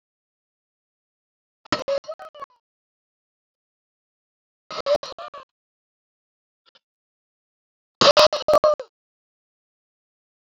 {"exhalation_length": "10.5 s", "exhalation_amplitude": 28361, "exhalation_signal_mean_std_ratio": 0.23, "survey_phase": "alpha (2021-03-01 to 2021-08-12)", "age": "65+", "gender": "Male", "wearing_mask": "No", "symptom_none": true, "smoker_status": "Ex-smoker", "respiratory_condition_asthma": false, "respiratory_condition_other": false, "recruitment_source": "REACT", "submission_delay": "8 days", "covid_test_result": "Negative", "covid_test_method": "RT-qPCR"}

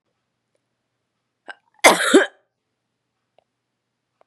{"cough_length": "4.3 s", "cough_amplitude": 32768, "cough_signal_mean_std_ratio": 0.22, "survey_phase": "beta (2021-08-13 to 2022-03-07)", "age": "18-44", "gender": "Female", "wearing_mask": "No", "symptom_cough_any": true, "symptom_runny_or_blocked_nose": true, "symptom_sore_throat": true, "symptom_abdominal_pain": true, "symptom_fatigue": true, "smoker_status": "Never smoked", "respiratory_condition_asthma": false, "respiratory_condition_other": false, "recruitment_source": "Test and Trace", "submission_delay": "2 days", "covid_test_result": "Positive", "covid_test_method": "RT-qPCR", "covid_ct_value": 17.9, "covid_ct_gene": "ORF1ab gene", "covid_ct_mean": 18.2, "covid_viral_load": "1100000 copies/ml", "covid_viral_load_category": "High viral load (>1M copies/ml)"}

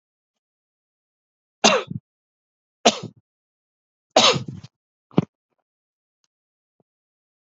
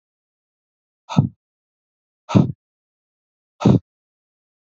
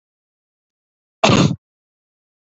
{"three_cough_length": "7.5 s", "three_cough_amplitude": 32768, "three_cough_signal_mean_std_ratio": 0.21, "exhalation_length": "4.6 s", "exhalation_amplitude": 30345, "exhalation_signal_mean_std_ratio": 0.23, "cough_length": "2.6 s", "cough_amplitude": 27961, "cough_signal_mean_std_ratio": 0.27, "survey_phase": "alpha (2021-03-01 to 2021-08-12)", "age": "45-64", "gender": "Male", "wearing_mask": "No", "symptom_none": true, "smoker_status": "Never smoked", "respiratory_condition_asthma": false, "respiratory_condition_other": false, "recruitment_source": "REACT", "submission_delay": "2 days", "covid_test_result": "Negative", "covid_test_method": "RT-qPCR"}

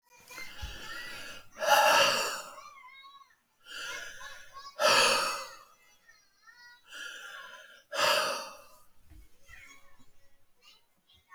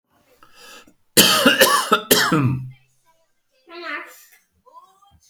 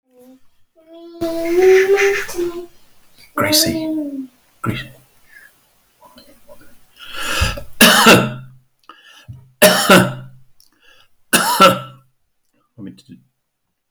{"exhalation_length": "11.3 s", "exhalation_amplitude": 9539, "exhalation_signal_mean_std_ratio": 0.42, "cough_length": "5.3 s", "cough_amplitude": 32768, "cough_signal_mean_std_ratio": 0.42, "three_cough_length": "13.9 s", "three_cough_amplitude": 32768, "three_cough_signal_mean_std_ratio": 0.44, "survey_phase": "alpha (2021-03-01 to 2021-08-12)", "age": "65+", "gender": "Male", "wearing_mask": "No", "symptom_none": true, "smoker_status": "Never smoked", "respiratory_condition_asthma": false, "respiratory_condition_other": false, "recruitment_source": "REACT", "submission_delay": "1 day", "covid_test_result": "Negative", "covid_test_method": "RT-qPCR"}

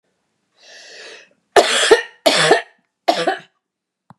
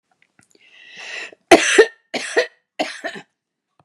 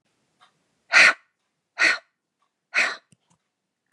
{"three_cough_length": "4.2 s", "three_cough_amplitude": 32768, "three_cough_signal_mean_std_ratio": 0.39, "cough_length": "3.8 s", "cough_amplitude": 32768, "cough_signal_mean_std_ratio": 0.3, "exhalation_length": "3.9 s", "exhalation_amplitude": 27073, "exhalation_signal_mean_std_ratio": 0.28, "survey_phase": "beta (2021-08-13 to 2022-03-07)", "age": "45-64", "gender": "Female", "wearing_mask": "No", "symptom_none": true, "smoker_status": "Never smoked", "respiratory_condition_asthma": false, "respiratory_condition_other": false, "recruitment_source": "REACT", "submission_delay": "5 days", "covid_test_result": "Negative", "covid_test_method": "RT-qPCR"}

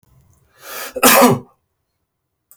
{"cough_length": "2.6 s", "cough_amplitude": 32768, "cough_signal_mean_std_ratio": 0.34, "survey_phase": "beta (2021-08-13 to 2022-03-07)", "age": "45-64", "gender": "Male", "wearing_mask": "No", "symptom_none": true, "smoker_status": "Ex-smoker", "respiratory_condition_asthma": false, "respiratory_condition_other": false, "recruitment_source": "REACT", "submission_delay": "1 day", "covid_test_result": "Negative", "covid_test_method": "RT-qPCR"}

